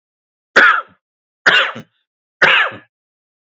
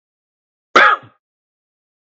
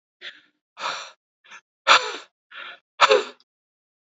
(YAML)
three_cough_length: 3.6 s
three_cough_amplitude: 32768
three_cough_signal_mean_std_ratio: 0.38
cough_length: 2.1 s
cough_amplitude: 27971
cough_signal_mean_std_ratio: 0.26
exhalation_length: 4.2 s
exhalation_amplitude: 27724
exhalation_signal_mean_std_ratio: 0.28
survey_phase: beta (2021-08-13 to 2022-03-07)
age: 45-64
gender: Male
wearing_mask: 'No'
symptom_none: true
smoker_status: Ex-smoker
respiratory_condition_asthma: false
respiratory_condition_other: false
recruitment_source: REACT
submission_delay: 4 days
covid_test_result: Negative
covid_test_method: RT-qPCR
influenza_a_test_result: Negative
influenza_b_test_result: Negative